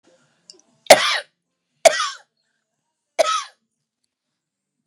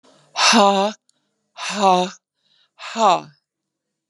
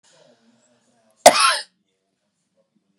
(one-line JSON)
{"three_cough_length": "4.9 s", "three_cough_amplitude": 32768, "three_cough_signal_mean_std_ratio": 0.24, "exhalation_length": "4.1 s", "exhalation_amplitude": 31399, "exhalation_signal_mean_std_ratio": 0.43, "cough_length": "3.0 s", "cough_amplitude": 32768, "cough_signal_mean_std_ratio": 0.22, "survey_phase": "beta (2021-08-13 to 2022-03-07)", "age": "65+", "gender": "Female", "wearing_mask": "No", "symptom_none": true, "smoker_status": "Ex-smoker", "respiratory_condition_asthma": false, "respiratory_condition_other": false, "recruitment_source": "REACT", "submission_delay": "0 days", "covid_test_result": "Negative", "covid_test_method": "RT-qPCR"}